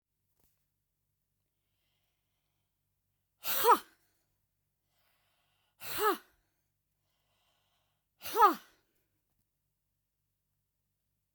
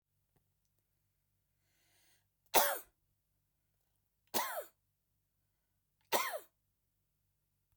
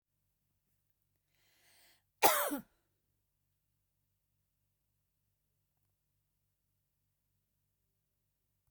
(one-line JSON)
{"exhalation_length": "11.3 s", "exhalation_amplitude": 8436, "exhalation_signal_mean_std_ratio": 0.2, "three_cough_length": "7.8 s", "three_cough_amplitude": 8637, "three_cough_signal_mean_std_ratio": 0.22, "cough_length": "8.7 s", "cough_amplitude": 11812, "cough_signal_mean_std_ratio": 0.15, "survey_phase": "beta (2021-08-13 to 2022-03-07)", "age": "65+", "gender": "Female", "wearing_mask": "No", "symptom_none": true, "smoker_status": "Never smoked", "respiratory_condition_asthma": false, "respiratory_condition_other": false, "recruitment_source": "REACT", "submission_delay": "1 day", "covid_test_result": "Negative", "covid_test_method": "RT-qPCR", "influenza_a_test_result": "Negative", "influenza_b_test_result": "Negative"}